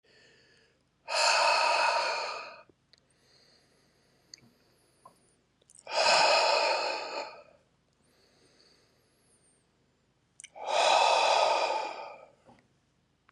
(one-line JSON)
{"exhalation_length": "13.3 s", "exhalation_amplitude": 8396, "exhalation_signal_mean_std_ratio": 0.46, "survey_phase": "beta (2021-08-13 to 2022-03-07)", "age": "18-44", "gender": "Male", "wearing_mask": "No", "symptom_cough_any": true, "symptom_runny_or_blocked_nose": true, "smoker_status": "Never smoked", "respiratory_condition_asthma": false, "respiratory_condition_other": false, "recruitment_source": "Test and Trace", "submission_delay": "2 days", "covid_test_result": "Positive", "covid_test_method": "RT-qPCR", "covid_ct_value": 18.6, "covid_ct_gene": "ORF1ab gene", "covid_ct_mean": 18.9, "covid_viral_load": "610000 copies/ml", "covid_viral_load_category": "Low viral load (10K-1M copies/ml)"}